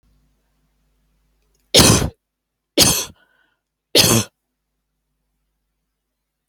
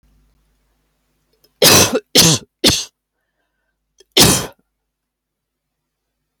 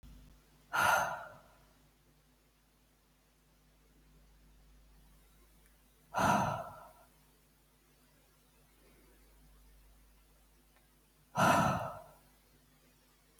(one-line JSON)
{"three_cough_length": "6.5 s", "three_cough_amplitude": 32768, "three_cough_signal_mean_std_ratio": 0.28, "cough_length": "6.4 s", "cough_amplitude": 32768, "cough_signal_mean_std_ratio": 0.32, "exhalation_length": "13.4 s", "exhalation_amplitude": 5152, "exhalation_signal_mean_std_ratio": 0.3, "survey_phase": "alpha (2021-03-01 to 2021-08-12)", "age": "65+", "gender": "Female", "wearing_mask": "No", "symptom_prefer_not_to_say": true, "symptom_onset": "12 days", "smoker_status": "Never smoked", "respiratory_condition_asthma": false, "respiratory_condition_other": false, "recruitment_source": "REACT", "submission_delay": "1 day", "covid_test_result": "Negative", "covid_test_method": "RT-qPCR"}